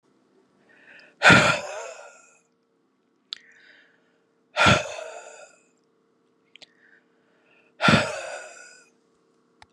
{"exhalation_length": "9.7 s", "exhalation_amplitude": 28893, "exhalation_signal_mean_std_ratio": 0.28, "survey_phase": "beta (2021-08-13 to 2022-03-07)", "age": "45-64", "gender": "Female", "wearing_mask": "No", "symptom_cough_any": true, "symptom_runny_or_blocked_nose": true, "symptom_sore_throat": true, "symptom_fatigue": true, "symptom_headache": true, "symptom_change_to_sense_of_smell_or_taste": true, "smoker_status": "Ex-smoker", "respiratory_condition_asthma": false, "respiratory_condition_other": false, "recruitment_source": "Test and Trace", "submission_delay": "2 days", "covid_test_result": "Negative", "covid_test_method": "RT-qPCR"}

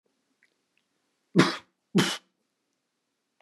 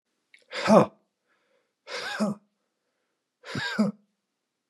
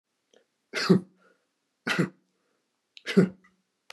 {"cough_length": "3.4 s", "cough_amplitude": 19088, "cough_signal_mean_std_ratio": 0.24, "exhalation_length": "4.7 s", "exhalation_amplitude": 23910, "exhalation_signal_mean_std_ratio": 0.3, "three_cough_length": "3.9 s", "three_cough_amplitude": 15985, "three_cough_signal_mean_std_ratio": 0.28, "survey_phase": "beta (2021-08-13 to 2022-03-07)", "age": "45-64", "gender": "Male", "wearing_mask": "No", "symptom_none": true, "smoker_status": "Never smoked", "respiratory_condition_asthma": false, "respiratory_condition_other": false, "recruitment_source": "REACT", "submission_delay": "1 day", "covid_test_result": "Negative", "covid_test_method": "RT-qPCR", "influenza_a_test_result": "Unknown/Void", "influenza_b_test_result": "Unknown/Void"}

